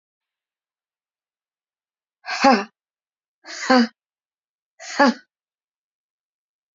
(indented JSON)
{
  "exhalation_length": "6.7 s",
  "exhalation_amplitude": 29829,
  "exhalation_signal_mean_std_ratio": 0.24,
  "survey_phase": "beta (2021-08-13 to 2022-03-07)",
  "age": "45-64",
  "gender": "Female",
  "wearing_mask": "No",
  "symptom_none": true,
  "smoker_status": "Ex-smoker",
  "respiratory_condition_asthma": false,
  "respiratory_condition_other": false,
  "recruitment_source": "REACT",
  "submission_delay": "3 days",
  "covid_test_result": "Negative",
  "covid_test_method": "RT-qPCR",
  "influenza_a_test_result": "Negative",
  "influenza_b_test_result": "Negative"
}